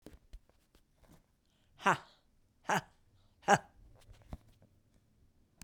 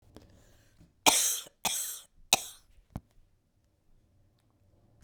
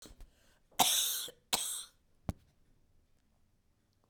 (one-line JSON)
{"exhalation_length": "5.6 s", "exhalation_amplitude": 10805, "exhalation_signal_mean_std_ratio": 0.21, "three_cough_length": "5.0 s", "three_cough_amplitude": 32767, "three_cough_signal_mean_std_ratio": 0.27, "cough_length": "4.1 s", "cough_amplitude": 8559, "cough_signal_mean_std_ratio": 0.34, "survey_phase": "beta (2021-08-13 to 2022-03-07)", "age": "65+", "gender": "Female", "wearing_mask": "No", "symptom_cough_any": true, "symptom_runny_or_blocked_nose": true, "smoker_status": "Never smoked", "respiratory_condition_asthma": true, "respiratory_condition_other": false, "recruitment_source": "Test and Trace", "submission_delay": "0 days", "covid_test_result": "Negative", "covid_test_method": "LFT"}